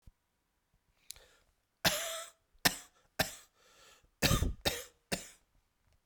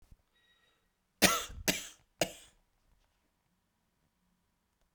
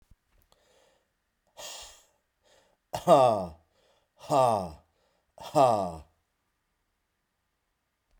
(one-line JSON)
{"cough_length": "6.1 s", "cough_amplitude": 9542, "cough_signal_mean_std_ratio": 0.31, "three_cough_length": "4.9 s", "three_cough_amplitude": 12621, "three_cough_signal_mean_std_ratio": 0.22, "exhalation_length": "8.2 s", "exhalation_amplitude": 15545, "exhalation_signal_mean_std_ratio": 0.3, "survey_phase": "beta (2021-08-13 to 2022-03-07)", "age": "45-64", "gender": "Male", "wearing_mask": "Yes", "symptom_cough_any": true, "symptom_runny_or_blocked_nose": true, "symptom_shortness_of_breath": true, "symptom_abdominal_pain": true, "symptom_fatigue": true, "symptom_headache": true, "symptom_change_to_sense_of_smell_or_taste": true, "symptom_onset": "3 days", "smoker_status": "Never smoked", "respiratory_condition_asthma": false, "respiratory_condition_other": false, "recruitment_source": "Test and Trace", "submission_delay": "1 day", "covid_test_result": "Positive", "covid_test_method": "ePCR"}